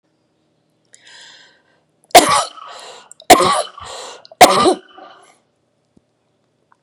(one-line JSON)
{"three_cough_length": "6.8 s", "three_cough_amplitude": 32768, "three_cough_signal_mean_std_ratio": 0.3, "survey_phase": "beta (2021-08-13 to 2022-03-07)", "age": "45-64", "gender": "Female", "wearing_mask": "No", "symptom_cough_any": true, "symptom_runny_or_blocked_nose": true, "symptom_sore_throat": true, "symptom_onset": "10 days", "smoker_status": "Ex-smoker", "respiratory_condition_asthma": false, "respiratory_condition_other": false, "recruitment_source": "REACT", "submission_delay": "6 days", "covid_test_result": "Negative", "covid_test_method": "RT-qPCR", "influenza_a_test_result": "Negative", "influenza_b_test_result": "Negative"}